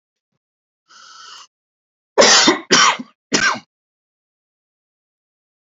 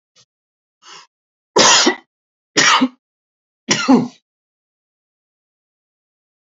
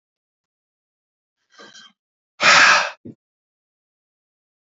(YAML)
cough_length: 5.6 s
cough_amplitude: 32768
cough_signal_mean_std_ratio: 0.32
three_cough_length: 6.5 s
three_cough_amplitude: 32768
three_cough_signal_mean_std_ratio: 0.32
exhalation_length: 4.8 s
exhalation_amplitude: 29937
exhalation_signal_mean_std_ratio: 0.25
survey_phase: beta (2021-08-13 to 2022-03-07)
age: 65+
gender: Male
wearing_mask: 'No'
symptom_none: true
smoker_status: Never smoked
respiratory_condition_asthma: false
respiratory_condition_other: false
recruitment_source: REACT
submission_delay: 3 days
covid_test_result: Negative
covid_test_method: RT-qPCR
influenza_a_test_result: Negative
influenza_b_test_result: Negative